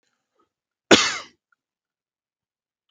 {
  "cough_length": "2.9 s",
  "cough_amplitude": 29256,
  "cough_signal_mean_std_ratio": 0.19,
  "survey_phase": "alpha (2021-03-01 to 2021-08-12)",
  "age": "18-44",
  "gender": "Male",
  "wearing_mask": "No",
  "symptom_none": true,
  "symptom_onset": "7 days",
  "smoker_status": "Never smoked",
  "respiratory_condition_asthma": false,
  "respiratory_condition_other": false,
  "recruitment_source": "REACT",
  "submission_delay": "3 days",
  "covid_test_result": "Negative",
  "covid_test_method": "RT-qPCR"
}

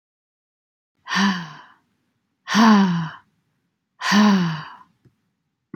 {
  "exhalation_length": "5.8 s",
  "exhalation_amplitude": 24209,
  "exhalation_signal_mean_std_ratio": 0.42,
  "survey_phase": "beta (2021-08-13 to 2022-03-07)",
  "age": "18-44",
  "gender": "Female",
  "wearing_mask": "No",
  "symptom_none": true,
  "symptom_onset": "12 days",
  "smoker_status": "Never smoked",
  "respiratory_condition_asthma": false,
  "respiratory_condition_other": false,
  "recruitment_source": "REACT",
  "submission_delay": "1 day",
  "covid_test_result": "Negative",
  "covid_test_method": "RT-qPCR"
}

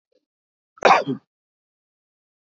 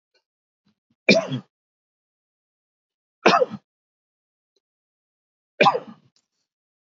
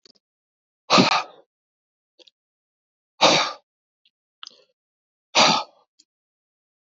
{
  "cough_length": "2.5 s",
  "cough_amplitude": 26928,
  "cough_signal_mean_std_ratio": 0.23,
  "three_cough_length": "7.0 s",
  "three_cough_amplitude": 26908,
  "three_cough_signal_mean_std_ratio": 0.22,
  "exhalation_length": "6.9 s",
  "exhalation_amplitude": 29396,
  "exhalation_signal_mean_std_ratio": 0.27,
  "survey_phase": "alpha (2021-03-01 to 2021-08-12)",
  "age": "45-64",
  "gender": "Male",
  "wearing_mask": "No",
  "symptom_none": true,
  "smoker_status": "Never smoked",
  "respiratory_condition_asthma": false,
  "respiratory_condition_other": false,
  "recruitment_source": "REACT",
  "submission_delay": "1 day",
  "covid_test_result": "Negative",
  "covid_test_method": "RT-qPCR"
}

